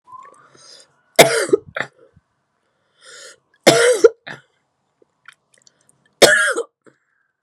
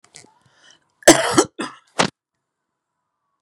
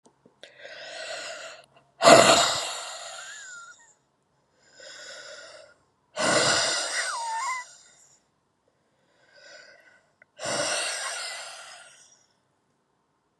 {"three_cough_length": "7.4 s", "three_cough_amplitude": 32768, "three_cough_signal_mean_std_ratio": 0.29, "cough_length": "3.4 s", "cough_amplitude": 32768, "cough_signal_mean_std_ratio": 0.25, "exhalation_length": "13.4 s", "exhalation_amplitude": 30321, "exhalation_signal_mean_std_ratio": 0.36, "survey_phase": "beta (2021-08-13 to 2022-03-07)", "age": "45-64", "gender": "Female", "wearing_mask": "No", "symptom_cough_any": true, "symptom_runny_or_blocked_nose": true, "symptom_diarrhoea": true, "symptom_fatigue": true, "symptom_onset": "5 days", "smoker_status": "Never smoked", "respiratory_condition_asthma": false, "respiratory_condition_other": false, "recruitment_source": "Test and Trace", "submission_delay": "1 day", "covid_test_result": "Positive", "covid_test_method": "RT-qPCR", "covid_ct_value": 16.4, "covid_ct_gene": "ORF1ab gene"}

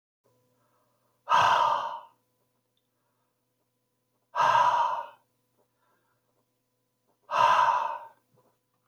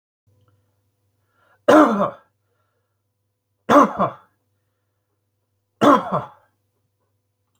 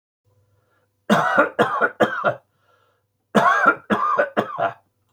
{"exhalation_length": "8.9 s", "exhalation_amplitude": 10530, "exhalation_signal_mean_std_ratio": 0.39, "three_cough_length": "7.6 s", "three_cough_amplitude": 27923, "three_cough_signal_mean_std_ratio": 0.28, "cough_length": "5.1 s", "cough_amplitude": 25778, "cough_signal_mean_std_ratio": 0.51, "survey_phase": "beta (2021-08-13 to 2022-03-07)", "age": "45-64", "gender": "Male", "wearing_mask": "No", "symptom_cough_any": true, "smoker_status": "Never smoked", "respiratory_condition_asthma": false, "respiratory_condition_other": false, "recruitment_source": "REACT", "submission_delay": "2 days", "covid_test_result": "Negative", "covid_test_method": "RT-qPCR", "influenza_a_test_result": "Negative", "influenza_b_test_result": "Negative"}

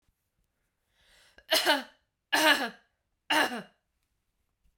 {"three_cough_length": "4.8 s", "three_cough_amplitude": 13329, "three_cough_signal_mean_std_ratio": 0.34, "survey_phase": "beta (2021-08-13 to 2022-03-07)", "age": "45-64", "gender": "Female", "wearing_mask": "Yes", "symptom_runny_or_blocked_nose": true, "symptom_fatigue": true, "symptom_change_to_sense_of_smell_or_taste": true, "smoker_status": "Prefer not to say", "respiratory_condition_asthma": false, "respiratory_condition_other": false, "recruitment_source": "Test and Trace", "submission_delay": "2 days", "covid_test_result": "Positive", "covid_test_method": "LFT"}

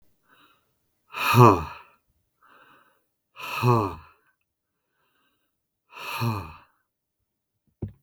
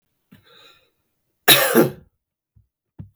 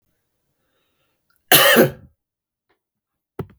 {"exhalation_length": "8.0 s", "exhalation_amplitude": 31862, "exhalation_signal_mean_std_ratio": 0.26, "three_cough_length": "3.2 s", "three_cough_amplitude": 32768, "three_cough_signal_mean_std_ratio": 0.28, "cough_length": "3.6 s", "cough_amplitude": 32768, "cough_signal_mean_std_ratio": 0.27, "survey_phase": "beta (2021-08-13 to 2022-03-07)", "age": "18-44", "gender": "Male", "wearing_mask": "No", "symptom_runny_or_blocked_nose": true, "smoker_status": "Never smoked", "respiratory_condition_asthma": false, "respiratory_condition_other": false, "recruitment_source": "REACT", "submission_delay": "2 days", "covid_test_result": "Negative", "covid_test_method": "RT-qPCR", "influenza_a_test_result": "Negative", "influenza_b_test_result": "Negative"}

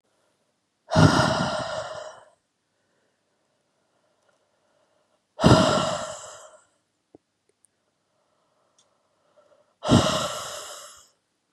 {"exhalation_length": "11.5 s", "exhalation_amplitude": 27567, "exhalation_signal_mean_std_ratio": 0.32, "survey_phase": "beta (2021-08-13 to 2022-03-07)", "age": "18-44", "gender": "Female", "wearing_mask": "No", "symptom_cough_any": true, "symptom_runny_or_blocked_nose": true, "symptom_sore_throat": true, "symptom_fatigue": true, "symptom_headache": true, "symptom_onset": "3 days", "smoker_status": "Never smoked", "respiratory_condition_asthma": false, "respiratory_condition_other": false, "recruitment_source": "Test and Trace", "submission_delay": "1 day", "covid_test_result": "Positive", "covid_test_method": "RT-qPCR", "covid_ct_value": 18.0, "covid_ct_gene": "ORF1ab gene", "covid_ct_mean": 18.1, "covid_viral_load": "1200000 copies/ml", "covid_viral_load_category": "High viral load (>1M copies/ml)"}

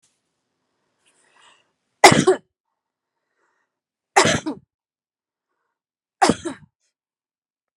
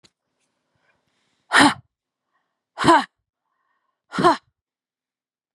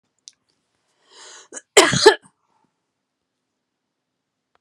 {"three_cough_length": "7.8 s", "three_cough_amplitude": 32768, "three_cough_signal_mean_std_ratio": 0.22, "exhalation_length": "5.5 s", "exhalation_amplitude": 31664, "exhalation_signal_mean_std_ratio": 0.25, "cough_length": "4.6 s", "cough_amplitude": 32768, "cough_signal_mean_std_ratio": 0.2, "survey_phase": "beta (2021-08-13 to 2022-03-07)", "age": "45-64", "gender": "Female", "wearing_mask": "No", "symptom_none": true, "smoker_status": "Never smoked", "respiratory_condition_asthma": false, "respiratory_condition_other": false, "recruitment_source": "REACT", "submission_delay": "1 day", "covid_test_result": "Negative", "covid_test_method": "RT-qPCR", "covid_ct_value": 43.0, "covid_ct_gene": "N gene"}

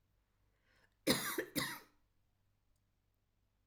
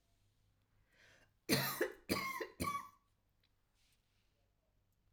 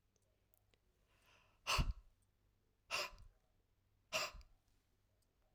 {"cough_length": "3.7 s", "cough_amplitude": 4024, "cough_signal_mean_std_ratio": 0.3, "three_cough_length": "5.1 s", "three_cough_amplitude": 4180, "three_cough_signal_mean_std_ratio": 0.35, "exhalation_length": "5.5 s", "exhalation_amplitude": 1666, "exhalation_signal_mean_std_ratio": 0.3, "survey_phase": "alpha (2021-03-01 to 2021-08-12)", "age": "45-64", "gender": "Female", "wearing_mask": "No", "symptom_none": true, "smoker_status": "Never smoked", "respiratory_condition_asthma": false, "respiratory_condition_other": false, "recruitment_source": "REACT", "submission_delay": "2 days", "covid_test_result": "Negative", "covid_test_method": "RT-qPCR"}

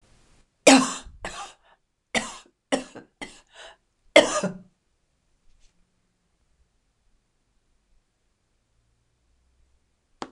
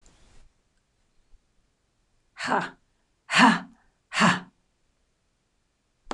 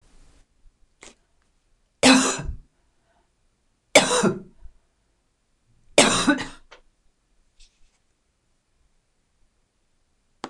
{"cough_length": "10.3 s", "cough_amplitude": 26028, "cough_signal_mean_std_ratio": 0.2, "exhalation_length": "6.1 s", "exhalation_amplitude": 19964, "exhalation_signal_mean_std_ratio": 0.27, "three_cough_length": "10.5 s", "three_cough_amplitude": 26028, "three_cough_signal_mean_std_ratio": 0.26, "survey_phase": "beta (2021-08-13 to 2022-03-07)", "age": "65+", "gender": "Female", "wearing_mask": "No", "symptom_cough_any": true, "symptom_new_continuous_cough": true, "symptom_sore_throat": true, "symptom_fatigue": true, "symptom_fever_high_temperature": true, "symptom_headache": true, "symptom_onset": "4 days", "smoker_status": "Never smoked", "respiratory_condition_asthma": false, "respiratory_condition_other": false, "recruitment_source": "Test and Trace", "submission_delay": "1 day", "covid_test_result": "Positive", "covid_test_method": "RT-qPCR", "covid_ct_value": 20.7, "covid_ct_gene": "ORF1ab gene"}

